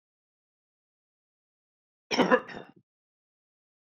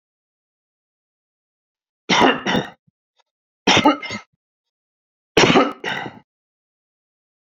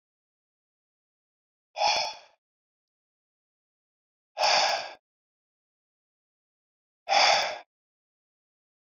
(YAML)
cough_length: 3.8 s
cough_amplitude: 15084
cough_signal_mean_std_ratio: 0.2
three_cough_length: 7.5 s
three_cough_amplitude: 31027
three_cough_signal_mean_std_ratio: 0.32
exhalation_length: 8.9 s
exhalation_amplitude: 13041
exhalation_signal_mean_std_ratio: 0.29
survey_phase: beta (2021-08-13 to 2022-03-07)
age: 45-64
gender: Male
wearing_mask: 'No'
symptom_none: true
smoker_status: Never smoked
respiratory_condition_asthma: false
respiratory_condition_other: false
recruitment_source: REACT
submission_delay: 11 days
covid_test_result: Negative
covid_test_method: RT-qPCR